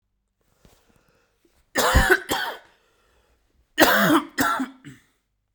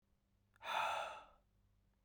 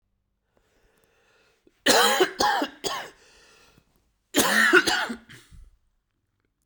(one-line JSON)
{"three_cough_length": "5.5 s", "three_cough_amplitude": 32767, "three_cough_signal_mean_std_ratio": 0.4, "exhalation_length": "2.0 s", "exhalation_amplitude": 1408, "exhalation_signal_mean_std_ratio": 0.44, "cough_length": "6.7 s", "cough_amplitude": 19342, "cough_signal_mean_std_ratio": 0.39, "survey_phase": "beta (2021-08-13 to 2022-03-07)", "age": "18-44", "gender": "Male", "wearing_mask": "No", "symptom_cough_any": true, "symptom_runny_or_blocked_nose": true, "symptom_sore_throat": true, "symptom_headache": true, "symptom_onset": "8 days", "smoker_status": "Ex-smoker", "respiratory_condition_asthma": true, "respiratory_condition_other": false, "recruitment_source": "REACT", "submission_delay": "0 days", "covid_test_result": "Negative", "covid_test_method": "RT-qPCR"}